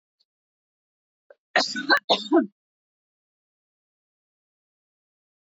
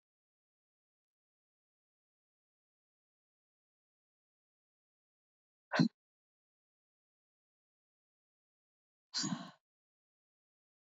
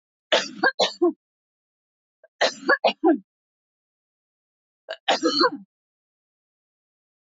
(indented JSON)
{
  "cough_length": "5.5 s",
  "cough_amplitude": 14732,
  "cough_signal_mean_std_ratio": 0.24,
  "exhalation_length": "10.8 s",
  "exhalation_amplitude": 5079,
  "exhalation_signal_mean_std_ratio": 0.13,
  "three_cough_length": "7.3 s",
  "three_cough_amplitude": 15938,
  "three_cough_signal_mean_std_ratio": 0.34,
  "survey_phase": "alpha (2021-03-01 to 2021-08-12)",
  "age": "45-64",
  "gender": "Female",
  "wearing_mask": "No",
  "symptom_cough_any": true,
  "symptom_shortness_of_breath": true,
  "symptom_fatigue": true,
  "symptom_headache": true,
  "symptom_change_to_sense_of_smell_or_taste": true,
  "symptom_onset": "12 days",
  "smoker_status": "Never smoked",
  "respiratory_condition_asthma": true,
  "respiratory_condition_other": false,
  "recruitment_source": "Test and Trace",
  "submission_delay": "1 day",
  "covid_test_result": "Positive",
  "covid_test_method": "RT-qPCR",
  "covid_ct_value": 33.7,
  "covid_ct_gene": "N gene"
}